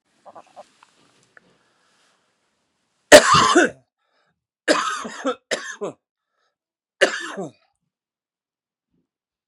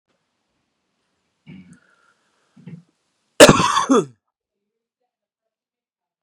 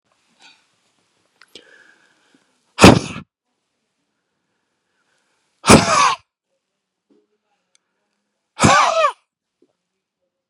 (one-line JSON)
{"three_cough_length": "9.5 s", "three_cough_amplitude": 32768, "three_cough_signal_mean_std_ratio": 0.25, "cough_length": "6.2 s", "cough_amplitude": 32768, "cough_signal_mean_std_ratio": 0.21, "exhalation_length": "10.5 s", "exhalation_amplitude": 32768, "exhalation_signal_mean_std_ratio": 0.25, "survey_phase": "beta (2021-08-13 to 2022-03-07)", "age": "45-64", "gender": "Male", "wearing_mask": "No", "symptom_change_to_sense_of_smell_or_taste": true, "smoker_status": "Never smoked", "respiratory_condition_asthma": false, "respiratory_condition_other": false, "recruitment_source": "Test and Trace", "submission_delay": "2 days", "covid_test_result": "Negative", "covid_test_method": "ePCR"}